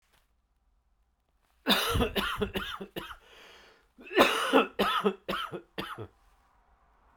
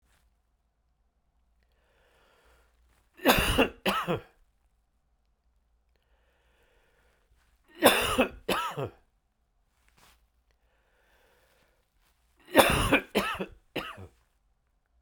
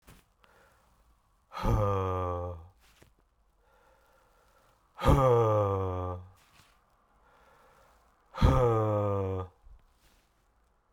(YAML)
cough_length: 7.2 s
cough_amplitude: 15639
cough_signal_mean_std_ratio: 0.43
three_cough_length: 15.0 s
three_cough_amplitude: 26539
three_cough_signal_mean_std_ratio: 0.29
exhalation_length: 10.9 s
exhalation_amplitude: 11449
exhalation_signal_mean_std_ratio: 0.44
survey_phase: beta (2021-08-13 to 2022-03-07)
age: 45-64
gender: Male
wearing_mask: 'No'
symptom_cough_any: true
symptom_new_continuous_cough: true
symptom_abdominal_pain: true
symptom_fatigue: true
symptom_fever_high_temperature: true
symptom_headache: true
symptom_onset: 3 days
smoker_status: Ex-smoker
respiratory_condition_asthma: false
respiratory_condition_other: false
recruitment_source: Test and Trace
submission_delay: 2 days
covid_test_result: Positive
covid_test_method: RT-qPCR
covid_ct_value: 16.9
covid_ct_gene: ORF1ab gene
covid_ct_mean: 17.4
covid_viral_load: 1900000 copies/ml
covid_viral_load_category: High viral load (>1M copies/ml)